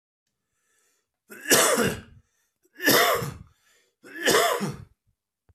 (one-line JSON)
{"three_cough_length": "5.5 s", "three_cough_amplitude": 21660, "three_cough_signal_mean_std_ratio": 0.43, "survey_phase": "beta (2021-08-13 to 2022-03-07)", "age": "45-64", "gender": "Male", "wearing_mask": "No", "symptom_cough_any": true, "symptom_onset": "12 days", "smoker_status": "Ex-smoker", "respiratory_condition_asthma": false, "respiratory_condition_other": false, "recruitment_source": "REACT", "submission_delay": "1 day", "covid_test_result": "Negative", "covid_test_method": "RT-qPCR", "influenza_a_test_result": "Negative", "influenza_b_test_result": "Negative"}